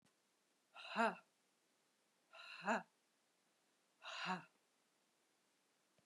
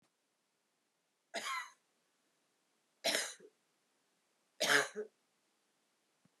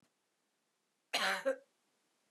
{
  "exhalation_length": "6.1 s",
  "exhalation_amplitude": 1978,
  "exhalation_signal_mean_std_ratio": 0.28,
  "three_cough_length": "6.4 s",
  "three_cough_amplitude": 5331,
  "three_cough_signal_mean_std_ratio": 0.27,
  "cough_length": "2.3 s",
  "cough_amplitude": 3341,
  "cough_signal_mean_std_ratio": 0.33,
  "survey_phase": "beta (2021-08-13 to 2022-03-07)",
  "age": "65+",
  "gender": "Female",
  "wearing_mask": "No",
  "symptom_cough_any": true,
  "symptom_runny_or_blocked_nose": true,
  "symptom_fatigue": true,
  "symptom_onset": "3 days",
  "smoker_status": "Never smoked",
  "respiratory_condition_asthma": false,
  "respiratory_condition_other": false,
  "recruitment_source": "Test and Trace",
  "submission_delay": "2 days",
  "covid_test_result": "Positive",
  "covid_test_method": "RT-qPCR",
  "covid_ct_value": 18.7,
  "covid_ct_gene": "S gene",
  "covid_ct_mean": 19.2,
  "covid_viral_load": "510000 copies/ml",
  "covid_viral_load_category": "Low viral load (10K-1M copies/ml)"
}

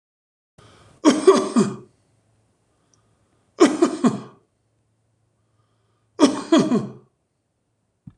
{
  "three_cough_length": "8.2 s",
  "three_cough_amplitude": 25993,
  "three_cough_signal_mean_std_ratio": 0.32,
  "survey_phase": "beta (2021-08-13 to 2022-03-07)",
  "age": "65+",
  "gender": "Male",
  "wearing_mask": "No",
  "symptom_change_to_sense_of_smell_or_taste": true,
  "smoker_status": "Ex-smoker",
  "respiratory_condition_asthma": true,
  "respiratory_condition_other": true,
  "recruitment_source": "REACT",
  "submission_delay": "3 days",
  "covid_test_result": "Negative",
  "covid_test_method": "RT-qPCR"
}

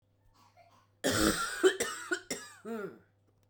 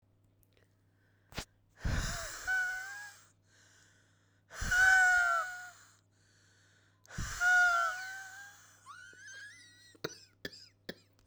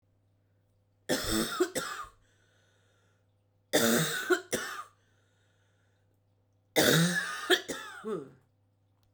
{
  "cough_length": "3.5 s",
  "cough_amplitude": 8437,
  "cough_signal_mean_std_ratio": 0.45,
  "exhalation_length": "11.3 s",
  "exhalation_amplitude": 5583,
  "exhalation_signal_mean_std_ratio": 0.44,
  "three_cough_length": "9.1 s",
  "three_cough_amplitude": 12949,
  "three_cough_signal_mean_std_ratio": 0.42,
  "survey_phase": "beta (2021-08-13 to 2022-03-07)",
  "age": "18-44",
  "gender": "Female",
  "wearing_mask": "No",
  "symptom_cough_any": true,
  "symptom_new_continuous_cough": true,
  "symptom_runny_or_blocked_nose": true,
  "symptom_shortness_of_breath": true,
  "symptom_sore_throat": true,
  "symptom_diarrhoea": true,
  "symptom_fatigue": true,
  "symptom_fever_high_temperature": true,
  "symptom_headache": true,
  "symptom_change_to_sense_of_smell_or_taste": true,
  "symptom_other": true,
  "symptom_onset": "5 days",
  "smoker_status": "Ex-smoker",
  "respiratory_condition_asthma": false,
  "respiratory_condition_other": false,
  "recruitment_source": "Test and Trace",
  "submission_delay": "1 day",
  "covid_test_result": "Positive",
  "covid_test_method": "ePCR"
}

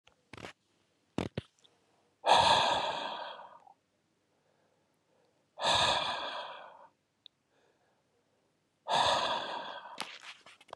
{
  "exhalation_length": "10.8 s",
  "exhalation_amplitude": 8885,
  "exhalation_signal_mean_std_ratio": 0.4,
  "survey_phase": "beta (2021-08-13 to 2022-03-07)",
  "age": "45-64",
  "gender": "Male",
  "wearing_mask": "No",
  "symptom_none": true,
  "symptom_onset": "12 days",
  "smoker_status": "Current smoker (11 or more cigarettes per day)",
  "respiratory_condition_asthma": false,
  "respiratory_condition_other": false,
  "recruitment_source": "REACT",
  "submission_delay": "1 day",
  "covid_test_result": "Negative",
  "covid_test_method": "RT-qPCR",
  "influenza_a_test_result": "Negative",
  "influenza_b_test_result": "Negative"
}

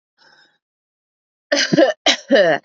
{
  "cough_length": "2.6 s",
  "cough_amplitude": 27497,
  "cough_signal_mean_std_ratio": 0.44,
  "survey_phase": "beta (2021-08-13 to 2022-03-07)",
  "age": "18-44",
  "gender": "Female",
  "wearing_mask": "No",
  "symptom_runny_or_blocked_nose": true,
  "symptom_abdominal_pain": true,
  "symptom_diarrhoea": true,
  "symptom_fatigue": true,
  "symptom_headache": true,
  "smoker_status": "Never smoked",
  "respiratory_condition_asthma": false,
  "respiratory_condition_other": false,
  "recruitment_source": "REACT",
  "submission_delay": "0 days",
  "covid_test_result": "Negative",
  "covid_test_method": "RT-qPCR",
  "influenza_a_test_result": "Negative",
  "influenza_b_test_result": "Negative"
}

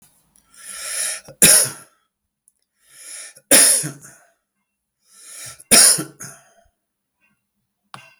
{
  "three_cough_length": "8.2 s",
  "three_cough_amplitude": 32768,
  "three_cough_signal_mean_std_ratio": 0.31,
  "survey_phase": "beta (2021-08-13 to 2022-03-07)",
  "age": "65+",
  "gender": "Male",
  "wearing_mask": "No",
  "symptom_none": true,
  "smoker_status": "Ex-smoker",
  "respiratory_condition_asthma": false,
  "respiratory_condition_other": false,
  "recruitment_source": "REACT",
  "submission_delay": "2 days",
  "covid_test_result": "Negative",
  "covid_test_method": "RT-qPCR"
}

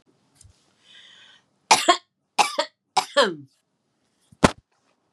{
  "three_cough_length": "5.1 s",
  "three_cough_amplitude": 32768,
  "three_cough_signal_mean_std_ratio": 0.26,
  "survey_phase": "beta (2021-08-13 to 2022-03-07)",
  "age": "65+",
  "gender": "Female",
  "wearing_mask": "No",
  "symptom_none": true,
  "smoker_status": "Never smoked",
  "respiratory_condition_asthma": false,
  "respiratory_condition_other": false,
  "recruitment_source": "REACT",
  "submission_delay": "2 days",
  "covid_test_result": "Negative",
  "covid_test_method": "RT-qPCR",
  "influenza_a_test_result": "Negative",
  "influenza_b_test_result": "Negative"
}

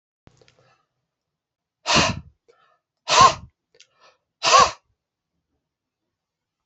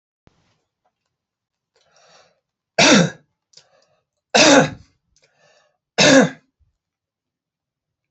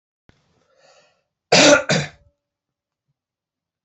{
  "exhalation_length": "6.7 s",
  "exhalation_amplitude": 28011,
  "exhalation_signal_mean_std_ratio": 0.26,
  "three_cough_length": "8.1 s",
  "three_cough_amplitude": 30821,
  "three_cough_signal_mean_std_ratio": 0.28,
  "cough_length": "3.8 s",
  "cough_amplitude": 30814,
  "cough_signal_mean_std_ratio": 0.27,
  "survey_phase": "alpha (2021-03-01 to 2021-08-12)",
  "age": "45-64",
  "gender": "Male",
  "wearing_mask": "No",
  "symptom_change_to_sense_of_smell_or_taste": true,
  "smoker_status": "Never smoked",
  "respiratory_condition_asthma": false,
  "respiratory_condition_other": false,
  "recruitment_source": "Test and Trace",
  "submission_delay": "2 days",
  "covid_test_result": "Positive",
  "covid_test_method": "RT-qPCR",
  "covid_ct_value": 15.1,
  "covid_ct_gene": "N gene",
  "covid_ct_mean": 15.6,
  "covid_viral_load": "7700000 copies/ml",
  "covid_viral_load_category": "High viral load (>1M copies/ml)"
}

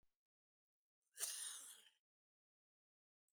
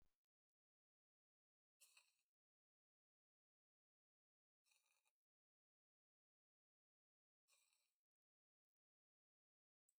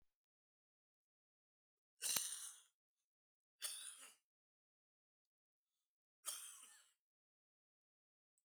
{
  "cough_length": "3.3 s",
  "cough_amplitude": 1021,
  "cough_signal_mean_std_ratio": 0.31,
  "exhalation_length": "10.0 s",
  "exhalation_amplitude": 54,
  "exhalation_signal_mean_std_ratio": 0.21,
  "three_cough_length": "8.4 s",
  "three_cough_amplitude": 10573,
  "three_cough_signal_mean_std_ratio": 0.25,
  "survey_phase": "beta (2021-08-13 to 2022-03-07)",
  "age": "45-64",
  "gender": "Male",
  "wearing_mask": "No",
  "symptom_cough_any": true,
  "symptom_onset": "12 days",
  "smoker_status": "Ex-smoker",
  "respiratory_condition_asthma": true,
  "respiratory_condition_other": false,
  "recruitment_source": "REACT",
  "submission_delay": "2 days",
  "covid_test_result": "Negative",
  "covid_test_method": "RT-qPCR",
  "influenza_a_test_result": "Negative",
  "influenza_b_test_result": "Negative"
}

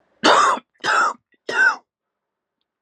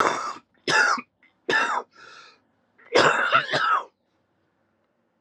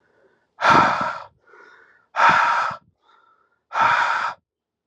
{
  "three_cough_length": "2.8 s",
  "three_cough_amplitude": 29229,
  "three_cough_signal_mean_std_ratio": 0.47,
  "cough_length": "5.2 s",
  "cough_amplitude": 20897,
  "cough_signal_mean_std_ratio": 0.49,
  "exhalation_length": "4.9 s",
  "exhalation_amplitude": 27484,
  "exhalation_signal_mean_std_ratio": 0.48,
  "survey_phase": "alpha (2021-03-01 to 2021-08-12)",
  "age": "18-44",
  "gender": "Male",
  "wearing_mask": "No",
  "symptom_cough_any": true,
  "symptom_fatigue": true,
  "symptom_headache": true,
  "symptom_change_to_sense_of_smell_or_taste": true,
  "symptom_loss_of_taste": true,
  "smoker_status": "Current smoker (e-cigarettes or vapes only)",
  "respiratory_condition_asthma": false,
  "respiratory_condition_other": false,
  "recruitment_source": "Test and Trace",
  "submission_delay": "3 days",
  "covid_test_result": "Positive",
  "covid_test_method": "LFT"
}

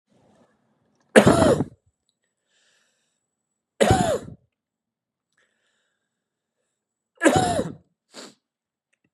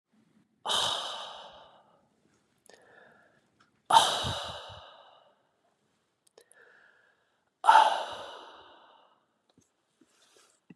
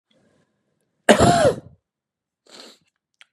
{
  "three_cough_length": "9.1 s",
  "three_cough_amplitude": 32703,
  "three_cough_signal_mean_std_ratio": 0.28,
  "exhalation_length": "10.8 s",
  "exhalation_amplitude": 17536,
  "exhalation_signal_mean_std_ratio": 0.27,
  "cough_length": "3.3 s",
  "cough_amplitude": 32767,
  "cough_signal_mean_std_ratio": 0.3,
  "survey_phase": "beta (2021-08-13 to 2022-03-07)",
  "age": "18-44",
  "gender": "Male",
  "wearing_mask": "No",
  "symptom_new_continuous_cough": true,
  "symptom_sore_throat": true,
  "symptom_fatigue": true,
  "symptom_other": true,
  "symptom_onset": "3 days",
  "smoker_status": "Never smoked",
  "respiratory_condition_asthma": false,
  "respiratory_condition_other": false,
  "recruitment_source": "Test and Trace",
  "submission_delay": "1 day",
  "covid_test_result": "Positive",
  "covid_test_method": "RT-qPCR",
  "covid_ct_value": 20.3,
  "covid_ct_gene": "ORF1ab gene",
  "covid_ct_mean": 21.0,
  "covid_viral_load": "130000 copies/ml",
  "covid_viral_load_category": "Low viral load (10K-1M copies/ml)"
}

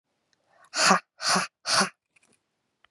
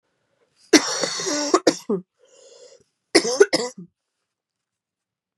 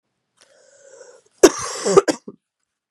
{
  "exhalation_length": "2.9 s",
  "exhalation_amplitude": 20636,
  "exhalation_signal_mean_std_ratio": 0.38,
  "three_cough_length": "5.4 s",
  "three_cough_amplitude": 32759,
  "three_cough_signal_mean_std_ratio": 0.33,
  "cough_length": "2.9 s",
  "cough_amplitude": 32768,
  "cough_signal_mean_std_ratio": 0.26,
  "survey_phase": "beta (2021-08-13 to 2022-03-07)",
  "age": "18-44",
  "gender": "Female",
  "wearing_mask": "No",
  "symptom_cough_any": true,
  "symptom_runny_or_blocked_nose": true,
  "symptom_sore_throat": true,
  "symptom_fatigue": true,
  "symptom_headache": true,
  "symptom_onset": "4 days",
  "smoker_status": "Never smoked",
  "respiratory_condition_asthma": false,
  "respiratory_condition_other": false,
  "recruitment_source": "Test and Trace",
  "submission_delay": "1 day",
  "covid_test_result": "Positive",
  "covid_test_method": "RT-qPCR",
  "covid_ct_value": 16.9,
  "covid_ct_gene": "N gene"
}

